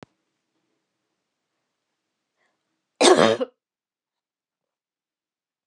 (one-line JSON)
{"cough_length": "5.7 s", "cough_amplitude": 27214, "cough_signal_mean_std_ratio": 0.19, "survey_phase": "beta (2021-08-13 to 2022-03-07)", "age": "45-64", "gender": "Female", "wearing_mask": "No", "symptom_cough_any": true, "symptom_fatigue": true, "smoker_status": "Never smoked", "respiratory_condition_asthma": true, "respiratory_condition_other": false, "recruitment_source": "REACT", "submission_delay": "1 day", "covid_test_result": "Negative", "covid_test_method": "RT-qPCR"}